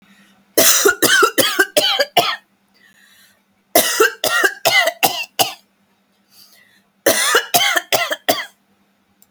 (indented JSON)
{
  "cough_length": "9.3 s",
  "cough_amplitude": 32768,
  "cough_signal_mean_std_ratio": 0.5,
  "survey_phase": "alpha (2021-03-01 to 2021-08-12)",
  "age": "18-44",
  "gender": "Female",
  "wearing_mask": "No",
  "symptom_none": true,
  "smoker_status": "Never smoked",
  "respiratory_condition_asthma": false,
  "respiratory_condition_other": false,
  "recruitment_source": "REACT",
  "submission_delay": "18 days",
  "covid_test_result": "Negative",
  "covid_test_method": "RT-qPCR"
}